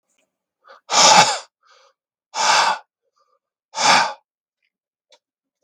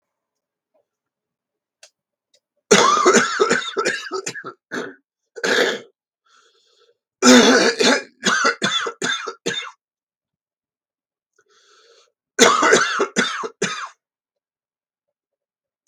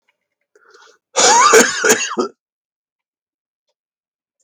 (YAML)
exhalation_length: 5.6 s
exhalation_amplitude: 32768
exhalation_signal_mean_std_ratio: 0.36
three_cough_length: 15.9 s
three_cough_amplitude: 32768
three_cough_signal_mean_std_ratio: 0.41
cough_length: 4.4 s
cough_amplitude: 32768
cough_signal_mean_std_ratio: 0.37
survey_phase: beta (2021-08-13 to 2022-03-07)
age: 45-64
gender: Male
wearing_mask: 'No'
symptom_cough_any: true
symptom_runny_or_blocked_nose: true
symptom_headache: true
symptom_loss_of_taste: true
smoker_status: Never smoked
respiratory_condition_asthma: true
respiratory_condition_other: false
recruitment_source: Test and Trace
submission_delay: 2 days
covid_test_result: Positive
covid_test_method: RT-qPCR